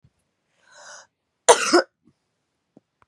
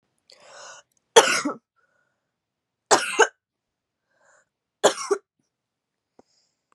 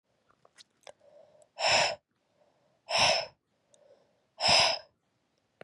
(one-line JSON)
{"cough_length": "3.1 s", "cough_amplitude": 32709, "cough_signal_mean_std_ratio": 0.22, "three_cough_length": "6.7 s", "three_cough_amplitude": 32767, "three_cough_signal_mean_std_ratio": 0.23, "exhalation_length": "5.6 s", "exhalation_amplitude": 9333, "exhalation_signal_mean_std_ratio": 0.36, "survey_phase": "beta (2021-08-13 to 2022-03-07)", "age": "18-44", "gender": "Female", "wearing_mask": "No", "symptom_cough_any": true, "symptom_runny_or_blocked_nose": true, "symptom_fatigue": true, "smoker_status": "Never smoked", "respiratory_condition_asthma": false, "respiratory_condition_other": false, "recruitment_source": "Test and Trace", "submission_delay": "1 day", "covid_test_result": "Positive", "covid_test_method": "LFT"}